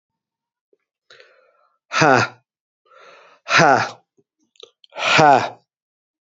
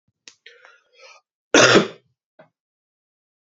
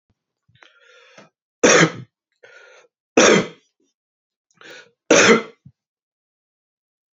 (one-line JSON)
{"exhalation_length": "6.4 s", "exhalation_amplitude": 32125, "exhalation_signal_mean_std_ratio": 0.33, "cough_length": "3.6 s", "cough_amplitude": 30660, "cough_signal_mean_std_ratio": 0.24, "three_cough_length": "7.2 s", "three_cough_amplitude": 31061, "three_cough_signal_mean_std_ratio": 0.29, "survey_phase": "beta (2021-08-13 to 2022-03-07)", "age": "45-64", "gender": "Male", "wearing_mask": "No", "symptom_cough_any": true, "symptom_runny_or_blocked_nose": true, "symptom_sore_throat": true, "symptom_abdominal_pain": true, "symptom_fatigue": true, "symptom_fever_high_temperature": true, "smoker_status": "Never smoked", "respiratory_condition_asthma": false, "respiratory_condition_other": false, "recruitment_source": "Test and Trace", "submission_delay": "2 days", "covid_test_result": "Positive", "covid_test_method": "RT-qPCR", "covid_ct_value": 22.7, "covid_ct_gene": "ORF1ab gene", "covid_ct_mean": 23.6, "covid_viral_load": "18000 copies/ml", "covid_viral_load_category": "Low viral load (10K-1M copies/ml)"}